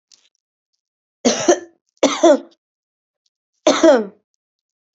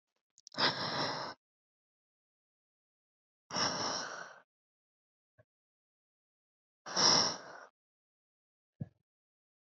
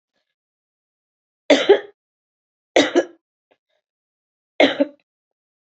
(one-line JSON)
{"cough_length": "4.9 s", "cough_amplitude": 28849, "cough_signal_mean_std_ratio": 0.33, "exhalation_length": "9.6 s", "exhalation_amplitude": 6453, "exhalation_signal_mean_std_ratio": 0.32, "three_cough_length": "5.6 s", "three_cough_amplitude": 29041, "three_cough_signal_mean_std_ratio": 0.25, "survey_phase": "beta (2021-08-13 to 2022-03-07)", "age": "18-44", "gender": "Female", "wearing_mask": "No", "symptom_none": true, "smoker_status": "Ex-smoker", "respiratory_condition_asthma": false, "respiratory_condition_other": false, "recruitment_source": "REACT", "submission_delay": "1 day", "covid_test_result": "Negative", "covid_test_method": "RT-qPCR"}